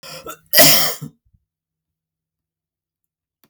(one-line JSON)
{"cough_length": "3.5 s", "cough_amplitude": 32768, "cough_signal_mean_std_ratio": 0.28, "survey_phase": "beta (2021-08-13 to 2022-03-07)", "age": "45-64", "gender": "Male", "wearing_mask": "No", "symptom_none": true, "smoker_status": "Never smoked", "respiratory_condition_asthma": false, "respiratory_condition_other": false, "recruitment_source": "REACT", "submission_delay": "0 days", "covid_test_result": "Negative", "covid_test_method": "RT-qPCR"}